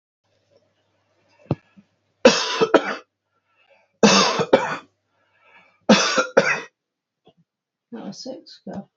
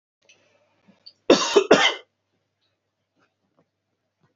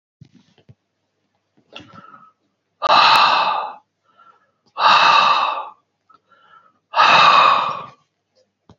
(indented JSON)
{
  "three_cough_length": "9.0 s",
  "three_cough_amplitude": 28225,
  "three_cough_signal_mean_std_ratio": 0.34,
  "cough_length": "4.4 s",
  "cough_amplitude": 27300,
  "cough_signal_mean_std_ratio": 0.25,
  "exhalation_length": "8.8 s",
  "exhalation_amplitude": 29106,
  "exhalation_signal_mean_std_ratio": 0.45,
  "survey_phase": "beta (2021-08-13 to 2022-03-07)",
  "age": "45-64",
  "gender": "Male",
  "wearing_mask": "No",
  "symptom_none": true,
  "smoker_status": "Never smoked",
  "respiratory_condition_asthma": false,
  "respiratory_condition_other": false,
  "recruitment_source": "REACT",
  "submission_delay": "2 days",
  "covid_test_result": "Negative",
  "covid_test_method": "RT-qPCR"
}